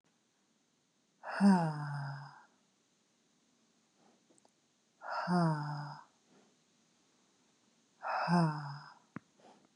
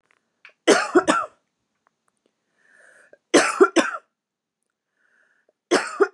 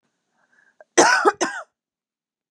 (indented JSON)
{
  "exhalation_length": "9.8 s",
  "exhalation_amplitude": 4828,
  "exhalation_signal_mean_std_ratio": 0.37,
  "three_cough_length": "6.1 s",
  "three_cough_amplitude": 30709,
  "three_cough_signal_mean_std_ratio": 0.32,
  "cough_length": "2.5 s",
  "cough_amplitude": 30163,
  "cough_signal_mean_std_ratio": 0.33,
  "survey_phase": "beta (2021-08-13 to 2022-03-07)",
  "age": "18-44",
  "gender": "Female",
  "wearing_mask": "No",
  "symptom_none": true,
  "smoker_status": "Current smoker (11 or more cigarettes per day)",
  "respiratory_condition_asthma": false,
  "respiratory_condition_other": false,
  "recruitment_source": "REACT",
  "submission_delay": "1 day",
  "covid_test_result": "Negative",
  "covid_test_method": "RT-qPCR",
  "influenza_a_test_result": "Negative",
  "influenza_b_test_result": "Negative"
}